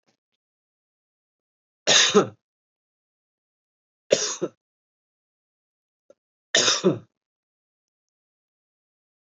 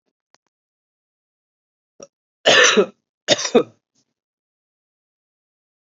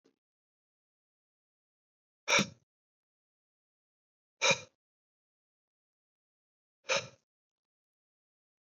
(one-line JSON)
{"three_cough_length": "9.4 s", "three_cough_amplitude": 26116, "three_cough_signal_mean_std_ratio": 0.24, "cough_length": "5.9 s", "cough_amplitude": 30848, "cough_signal_mean_std_ratio": 0.25, "exhalation_length": "8.6 s", "exhalation_amplitude": 7000, "exhalation_signal_mean_std_ratio": 0.18, "survey_phase": "beta (2021-08-13 to 2022-03-07)", "age": "18-44", "gender": "Male", "wearing_mask": "No", "symptom_fatigue": true, "symptom_headache": true, "smoker_status": "Never smoked", "respiratory_condition_asthma": false, "respiratory_condition_other": false, "recruitment_source": "Test and Trace", "submission_delay": "2 days", "covid_test_result": "Positive", "covid_test_method": "ePCR"}